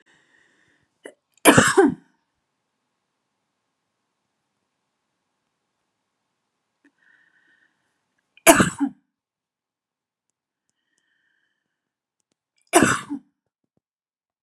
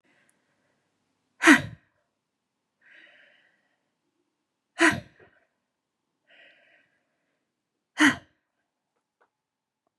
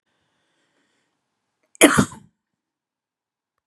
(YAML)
three_cough_length: 14.4 s
three_cough_amplitude: 32768
three_cough_signal_mean_std_ratio: 0.2
exhalation_length: 10.0 s
exhalation_amplitude: 26363
exhalation_signal_mean_std_ratio: 0.17
cough_length: 3.7 s
cough_amplitude: 32768
cough_signal_mean_std_ratio: 0.19
survey_phase: beta (2021-08-13 to 2022-03-07)
age: 45-64
gender: Female
wearing_mask: 'No'
symptom_none: true
smoker_status: Never smoked
respiratory_condition_asthma: false
respiratory_condition_other: false
recruitment_source: REACT
submission_delay: 2 days
covid_test_result: Negative
covid_test_method: RT-qPCR